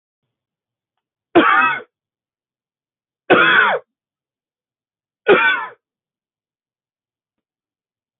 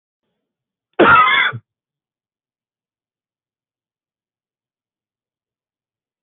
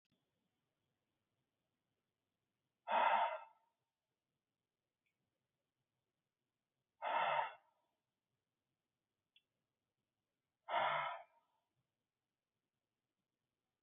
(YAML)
three_cough_length: 8.2 s
three_cough_amplitude: 28919
three_cough_signal_mean_std_ratio: 0.32
cough_length: 6.2 s
cough_amplitude: 27473
cough_signal_mean_std_ratio: 0.24
exhalation_length: 13.8 s
exhalation_amplitude: 2113
exhalation_signal_mean_std_ratio: 0.26
survey_phase: beta (2021-08-13 to 2022-03-07)
age: 45-64
gender: Male
wearing_mask: 'No'
symptom_cough_any: true
symptom_runny_or_blocked_nose: true
symptom_fatigue: true
symptom_onset: 2 days
smoker_status: Never smoked
respiratory_condition_asthma: false
respiratory_condition_other: false
recruitment_source: Test and Trace
submission_delay: 1 day
covid_test_result: Positive
covid_test_method: ePCR